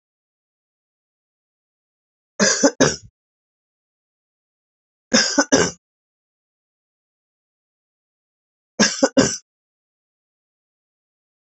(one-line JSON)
{"three_cough_length": "11.4 s", "three_cough_amplitude": 28441, "three_cough_signal_mean_std_ratio": 0.25, "survey_phase": "beta (2021-08-13 to 2022-03-07)", "age": "45-64", "gender": "Female", "wearing_mask": "No", "symptom_cough_any": true, "symptom_new_continuous_cough": true, "symptom_runny_or_blocked_nose": true, "symptom_shortness_of_breath": true, "symptom_sore_throat": true, "symptom_abdominal_pain": true, "symptom_fatigue": true, "symptom_fever_high_temperature": true, "symptom_headache": true, "symptom_change_to_sense_of_smell_or_taste": true, "symptom_loss_of_taste": true, "symptom_onset": "2 days", "smoker_status": "Never smoked", "respiratory_condition_asthma": false, "respiratory_condition_other": false, "recruitment_source": "Test and Trace", "submission_delay": "2 days", "covid_test_result": "Positive", "covid_test_method": "ePCR"}